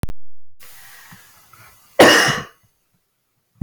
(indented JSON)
{
  "cough_length": "3.6 s",
  "cough_amplitude": 31589,
  "cough_signal_mean_std_ratio": 0.4,
  "survey_phase": "beta (2021-08-13 to 2022-03-07)",
  "age": "45-64",
  "gender": "Female",
  "wearing_mask": "No",
  "symptom_runny_or_blocked_nose": true,
  "smoker_status": "Never smoked",
  "respiratory_condition_asthma": false,
  "respiratory_condition_other": false,
  "recruitment_source": "REACT",
  "submission_delay": "1 day",
  "covid_test_result": "Negative",
  "covid_test_method": "RT-qPCR"
}